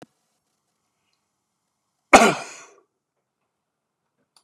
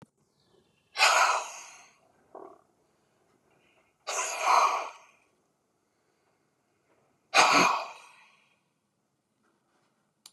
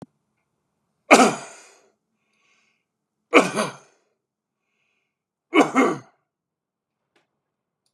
{"cough_length": "4.4 s", "cough_amplitude": 32768, "cough_signal_mean_std_ratio": 0.17, "exhalation_length": "10.3 s", "exhalation_amplitude": 20287, "exhalation_signal_mean_std_ratio": 0.32, "three_cough_length": "7.9 s", "three_cough_amplitude": 32767, "three_cough_signal_mean_std_ratio": 0.24, "survey_phase": "beta (2021-08-13 to 2022-03-07)", "age": "45-64", "gender": "Male", "wearing_mask": "No", "symptom_none": true, "smoker_status": "Never smoked", "respiratory_condition_asthma": true, "respiratory_condition_other": false, "recruitment_source": "REACT", "submission_delay": "1 day", "covid_test_result": "Negative", "covid_test_method": "RT-qPCR"}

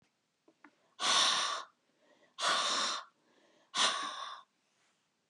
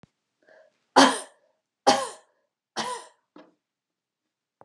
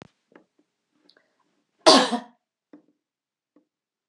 {"exhalation_length": "5.3 s", "exhalation_amplitude": 5604, "exhalation_signal_mean_std_ratio": 0.48, "three_cough_length": "4.6 s", "three_cough_amplitude": 25996, "three_cough_signal_mean_std_ratio": 0.24, "cough_length": "4.1 s", "cough_amplitude": 31152, "cough_signal_mean_std_ratio": 0.19, "survey_phase": "beta (2021-08-13 to 2022-03-07)", "age": "45-64", "gender": "Female", "wearing_mask": "No", "symptom_new_continuous_cough": true, "symptom_runny_or_blocked_nose": true, "symptom_sore_throat": true, "symptom_fever_high_temperature": true, "symptom_onset": "4 days", "smoker_status": "Never smoked", "respiratory_condition_asthma": false, "respiratory_condition_other": false, "recruitment_source": "Test and Trace", "submission_delay": "2 days", "covid_test_result": "Positive", "covid_test_method": "RT-qPCR", "covid_ct_value": 24.7, "covid_ct_gene": "ORF1ab gene", "covid_ct_mean": 25.1, "covid_viral_load": "5700 copies/ml", "covid_viral_load_category": "Minimal viral load (< 10K copies/ml)"}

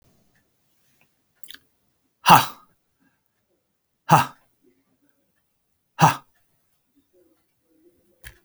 {"exhalation_length": "8.4 s", "exhalation_amplitude": 32767, "exhalation_signal_mean_std_ratio": 0.18, "survey_phase": "beta (2021-08-13 to 2022-03-07)", "age": "65+", "gender": "Male", "wearing_mask": "No", "symptom_none": true, "smoker_status": "Never smoked", "respiratory_condition_asthma": false, "respiratory_condition_other": true, "recruitment_source": "REACT", "submission_delay": "2 days", "covid_test_result": "Negative", "covid_test_method": "RT-qPCR"}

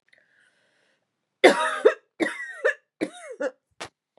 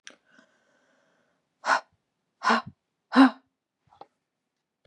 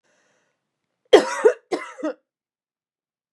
{"three_cough_length": "4.2 s", "three_cough_amplitude": 30902, "three_cough_signal_mean_std_ratio": 0.31, "exhalation_length": "4.9 s", "exhalation_amplitude": 18847, "exhalation_signal_mean_std_ratio": 0.23, "cough_length": "3.3 s", "cough_amplitude": 32767, "cough_signal_mean_std_ratio": 0.25, "survey_phase": "beta (2021-08-13 to 2022-03-07)", "age": "18-44", "gender": "Female", "wearing_mask": "No", "symptom_cough_any": true, "symptom_sore_throat": true, "symptom_onset": "3 days", "smoker_status": "Never smoked", "respiratory_condition_asthma": true, "respiratory_condition_other": false, "recruitment_source": "Test and Trace", "submission_delay": "2 days", "covid_test_result": "Positive", "covid_test_method": "RT-qPCR", "covid_ct_value": 20.3, "covid_ct_gene": "ORF1ab gene", "covid_ct_mean": 20.4, "covid_viral_load": "200000 copies/ml", "covid_viral_load_category": "Low viral load (10K-1M copies/ml)"}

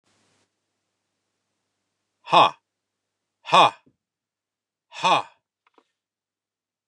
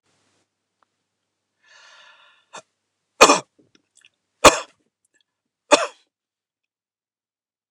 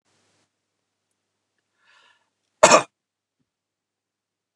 {"exhalation_length": "6.9 s", "exhalation_amplitude": 28076, "exhalation_signal_mean_std_ratio": 0.21, "three_cough_length": "7.7 s", "three_cough_amplitude": 29204, "three_cough_signal_mean_std_ratio": 0.16, "cough_length": "4.6 s", "cough_amplitude": 29204, "cough_signal_mean_std_ratio": 0.15, "survey_phase": "beta (2021-08-13 to 2022-03-07)", "age": "45-64", "gender": "Male", "wearing_mask": "No", "symptom_none": true, "smoker_status": "Never smoked", "respiratory_condition_asthma": false, "respiratory_condition_other": false, "recruitment_source": "REACT", "submission_delay": "4 days", "covid_test_result": "Negative", "covid_test_method": "RT-qPCR"}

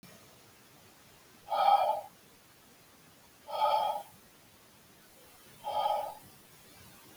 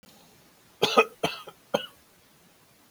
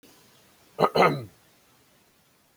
{"exhalation_length": "7.2 s", "exhalation_amplitude": 7009, "exhalation_signal_mean_std_ratio": 0.41, "three_cough_length": "2.9 s", "three_cough_amplitude": 19508, "three_cough_signal_mean_std_ratio": 0.28, "cough_length": "2.6 s", "cough_amplitude": 20473, "cough_signal_mean_std_ratio": 0.29, "survey_phase": "beta (2021-08-13 to 2022-03-07)", "age": "18-44", "gender": "Male", "wearing_mask": "No", "symptom_none": true, "smoker_status": "Never smoked", "respiratory_condition_asthma": false, "respiratory_condition_other": false, "recruitment_source": "REACT", "submission_delay": "2 days", "covid_test_result": "Negative", "covid_test_method": "RT-qPCR"}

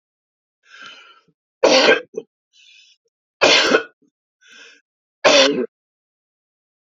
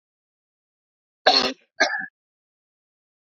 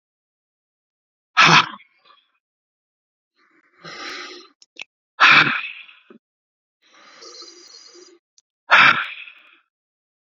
{"three_cough_length": "6.8 s", "three_cough_amplitude": 30184, "three_cough_signal_mean_std_ratio": 0.34, "cough_length": "3.3 s", "cough_amplitude": 26854, "cough_signal_mean_std_ratio": 0.27, "exhalation_length": "10.2 s", "exhalation_amplitude": 32768, "exhalation_signal_mean_std_ratio": 0.27, "survey_phase": "beta (2021-08-13 to 2022-03-07)", "age": "45-64", "gender": "Male", "wearing_mask": "No", "symptom_none": true, "smoker_status": "Ex-smoker", "respiratory_condition_asthma": false, "respiratory_condition_other": false, "recruitment_source": "Test and Trace", "submission_delay": "2 days", "covid_test_result": "Positive", "covid_test_method": "RT-qPCR", "covid_ct_value": 22.3, "covid_ct_gene": "ORF1ab gene", "covid_ct_mean": 22.6, "covid_viral_load": "40000 copies/ml", "covid_viral_load_category": "Low viral load (10K-1M copies/ml)"}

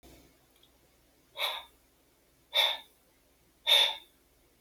{"exhalation_length": "4.6 s", "exhalation_amplitude": 9489, "exhalation_signal_mean_std_ratio": 0.31, "survey_phase": "beta (2021-08-13 to 2022-03-07)", "age": "45-64", "gender": "Male", "wearing_mask": "No", "symptom_none": true, "smoker_status": "Never smoked", "respiratory_condition_asthma": false, "respiratory_condition_other": false, "recruitment_source": "REACT", "submission_delay": "1 day", "covid_test_result": "Negative", "covid_test_method": "RT-qPCR"}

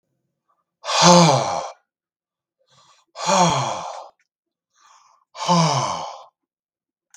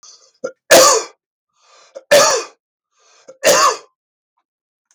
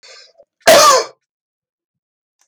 {"exhalation_length": "7.2 s", "exhalation_amplitude": 32768, "exhalation_signal_mean_std_ratio": 0.41, "three_cough_length": "4.9 s", "three_cough_amplitude": 32768, "three_cough_signal_mean_std_ratio": 0.38, "cough_length": "2.5 s", "cough_amplitude": 32768, "cough_signal_mean_std_ratio": 0.35, "survey_phase": "beta (2021-08-13 to 2022-03-07)", "age": "45-64", "gender": "Male", "wearing_mask": "No", "symptom_none": true, "smoker_status": "Ex-smoker", "respiratory_condition_asthma": false, "respiratory_condition_other": false, "recruitment_source": "REACT", "submission_delay": "1 day", "covid_test_result": "Negative", "covid_test_method": "RT-qPCR", "influenza_a_test_result": "Negative", "influenza_b_test_result": "Negative"}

